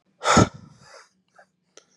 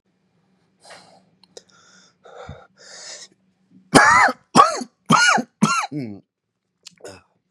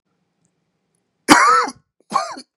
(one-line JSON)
{"exhalation_length": "2.0 s", "exhalation_amplitude": 27231, "exhalation_signal_mean_std_ratio": 0.28, "three_cough_length": "7.5 s", "three_cough_amplitude": 32768, "three_cough_signal_mean_std_ratio": 0.33, "cough_length": "2.6 s", "cough_amplitude": 32768, "cough_signal_mean_std_ratio": 0.36, "survey_phase": "beta (2021-08-13 to 2022-03-07)", "age": "18-44", "gender": "Male", "wearing_mask": "No", "symptom_cough_any": true, "symptom_new_continuous_cough": true, "symptom_runny_or_blocked_nose": true, "symptom_shortness_of_breath": true, "symptom_sore_throat": true, "symptom_diarrhoea": true, "symptom_fatigue": true, "symptom_fever_high_temperature": true, "symptom_headache": true, "symptom_onset": "4 days", "smoker_status": "Current smoker (11 or more cigarettes per day)", "respiratory_condition_asthma": false, "respiratory_condition_other": true, "recruitment_source": "Test and Trace", "submission_delay": "2 days", "covid_test_result": "Positive", "covid_test_method": "RT-qPCR", "covid_ct_value": 18.5, "covid_ct_gene": "ORF1ab gene", "covid_ct_mean": 19.0, "covid_viral_load": "600000 copies/ml", "covid_viral_load_category": "Low viral load (10K-1M copies/ml)"}